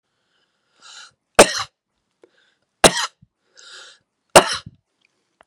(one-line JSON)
{"three_cough_length": "5.5 s", "three_cough_amplitude": 32768, "three_cough_signal_mean_std_ratio": 0.2, "survey_phase": "beta (2021-08-13 to 2022-03-07)", "age": "45-64", "gender": "Male", "wearing_mask": "No", "symptom_runny_or_blocked_nose": true, "smoker_status": "Never smoked", "respiratory_condition_asthma": false, "respiratory_condition_other": false, "recruitment_source": "REACT", "submission_delay": "1 day", "covid_test_result": "Negative", "covid_test_method": "RT-qPCR", "influenza_a_test_result": "Negative", "influenza_b_test_result": "Negative"}